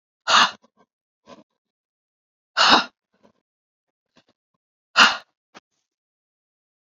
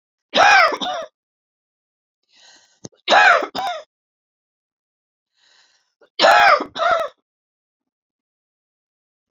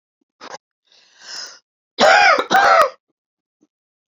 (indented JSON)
{
  "exhalation_length": "6.8 s",
  "exhalation_amplitude": 31589,
  "exhalation_signal_mean_std_ratio": 0.24,
  "three_cough_length": "9.3 s",
  "three_cough_amplitude": 29535,
  "three_cough_signal_mean_std_ratio": 0.35,
  "cough_length": "4.1 s",
  "cough_amplitude": 28785,
  "cough_signal_mean_std_ratio": 0.39,
  "survey_phase": "beta (2021-08-13 to 2022-03-07)",
  "age": "65+",
  "gender": "Female",
  "wearing_mask": "No",
  "symptom_diarrhoea": true,
  "symptom_onset": "12 days",
  "smoker_status": "Ex-smoker",
  "respiratory_condition_asthma": false,
  "respiratory_condition_other": false,
  "recruitment_source": "REACT",
  "submission_delay": "1 day",
  "covid_test_result": "Negative",
  "covid_test_method": "RT-qPCR",
  "influenza_a_test_result": "Negative",
  "influenza_b_test_result": "Negative"
}